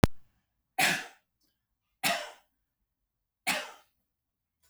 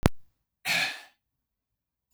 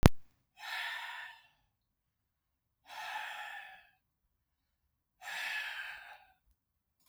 {
  "three_cough_length": "4.7 s",
  "three_cough_amplitude": 24762,
  "three_cough_signal_mean_std_ratio": 0.29,
  "cough_length": "2.1 s",
  "cough_amplitude": 25460,
  "cough_signal_mean_std_ratio": 0.34,
  "exhalation_length": "7.1 s",
  "exhalation_amplitude": 24101,
  "exhalation_signal_mean_std_ratio": 0.28,
  "survey_phase": "beta (2021-08-13 to 2022-03-07)",
  "age": "65+",
  "gender": "Male",
  "wearing_mask": "No",
  "symptom_abdominal_pain": true,
  "smoker_status": "Ex-smoker",
  "respiratory_condition_asthma": false,
  "respiratory_condition_other": false,
  "recruitment_source": "REACT",
  "submission_delay": "0 days",
  "covid_test_result": "Negative",
  "covid_test_method": "RT-qPCR"
}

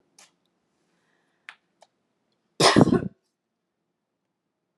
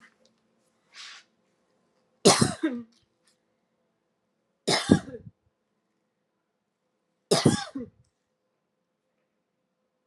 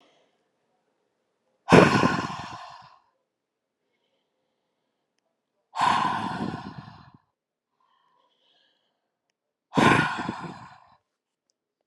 {
  "cough_length": "4.8 s",
  "cough_amplitude": 27173,
  "cough_signal_mean_std_ratio": 0.21,
  "three_cough_length": "10.1 s",
  "three_cough_amplitude": 25912,
  "three_cough_signal_mean_std_ratio": 0.23,
  "exhalation_length": "11.9 s",
  "exhalation_amplitude": 28434,
  "exhalation_signal_mean_std_ratio": 0.29,
  "survey_phase": "beta (2021-08-13 to 2022-03-07)",
  "age": "18-44",
  "gender": "Female",
  "wearing_mask": "No",
  "symptom_runny_or_blocked_nose": true,
  "symptom_onset": "5 days",
  "smoker_status": "Never smoked",
  "respiratory_condition_asthma": false,
  "respiratory_condition_other": false,
  "recruitment_source": "REACT",
  "submission_delay": "1 day",
  "covid_test_result": "Negative",
  "covid_test_method": "RT-qPCR"
}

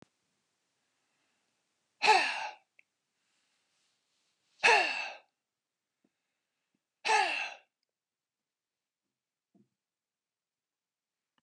{
  "exhalation_length": "11.4 s",
  "exhalation_amplitude": 11134,
  "exhalation_signal_mean_std_ratio": 0.24,
  "survey_phase": "beta (2021-08-13 to 2022-03-07)",
  "age": "65+",
  "gender": "Male",
  "wearing_mask": "No",
  "symptom_none": true,
  "smoker_status": "Ex-smoker",
  "respiratory_condition_asthma": false,
  "respiratory_condition_other": false,
  "recruitment_source": "REACT",
  "submission_delay": "1 day",
  "covid_test_result": "Negative",
  "covid_test_method": "RT-qPCR",
  "influenza_a_test_result": "Negative",
  "influenza_b_test_result": "Negative"
}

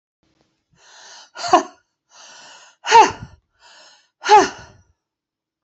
{
  "exhalation_length": "5.6 s",
  "exhalation_amplitude": 28474,
  "exhalation_signal_mean_std_ratio": 0.27,
  "survey_phase": "beta (2021-08-13 to 2022-03-07)",
  "age": "65+",
  "gender": "Female",
  "wearing_mask": "No",
  "symptom_none": true,
  "smoker_status": "Ex-smoker",
  "respiratory_condition_asthma": false,
  "respiratory_condition_other": false,
  "recruitment_source": "REACT",
  "submission_delay": "1 day",
  "covid_test_result": "Negative",
  "covid_test_method": "RT-qPCR"
}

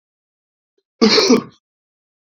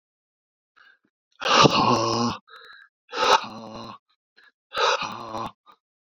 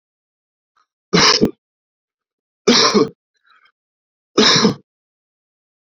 {
  "cough_length": "2.4 s",
  "cough_amplitude": 30370,
  "cough_signal_mean_std_ratio": 0.33,
  "exhalation_length": "6.1 s",
  "exhalation_amplitude": 27435,
  "exhalation_signal_mean_std_ratio": 0.42,
  "three_cough_length": "5.9 s",
  "three_cough_amplitude": 31881,
  "three_cough_signal_mean_std_ratio": 0.35,
  "survey_phase": "beta (2021-08-13 to 2022-03-07)",
  "age": "45-64",
  "gender": "Male",
  "wearing_mask": "No",
  "symptom_runny_or_blocked_nose": true,
  "symptom_fatigue": true,
  "symptom_headache": true,
  "symptom_change_to_sense_of_smell_or_taste": true,
  "symptom_loss_of_taste": true,
  "smoker_status": "Ex-smoker",
  "respiratory_condition_asthma": false,
  "respiratory_condition_other": false,
  "recruitment_source": "Test and Trace",
  "submission_delay": "0 days",
  "covid_test_result": "Positive",
  "covid_test_method": "LFT"
}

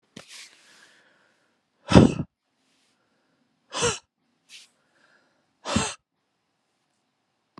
{
  "exhalation_length": "7.6 s",
  "exhalation_amplitude": 29548,
  "exhalation_signal_mean_std_ratio": 0.2,
  "survey_phase": "beta (2021-08-13 to 2022-03-07)",
  "age": "18-44",
  "gender": "Male",
  "wearing_mask": "No",
  "symptom_cough_any": true,
  "symptom_new_continuous_cough": true,
  "symptom_runny_or_blocked_nose": true,
  "symptom_shortness_of_breath": true,
  "symptom_abdominal_pain": true,
  "symptom_diarrhoea": true,
  "symptom_fatigue": true,
  "symptom_headache": true,
  "symptom_change_to_sense_of_smell_or_taste": true,
  "symptom_loss_of_taste": true,
  "symptom_onset": "3 days",
  "smoker_status": "Never smoked",
  "respiratory_condition_asthma": false,
  "respiratory_condition_other": false,
  "recruitment_source": "Test and Trace",
  "submission_delay": "1 day",
  "covid_test_result": "Positive",
  "covid_test_method": "RT-qPCR",
  "covid_ct_value": 18.5,
  "covid_ct_gene": "ORF1ab gene",
  "covid_ct_mean": 18.9,
  "covid_viral_load": "630000 copies/ml",
  "covid_viral_load_category": "Low viral load (10K-1M copies/ml)"
}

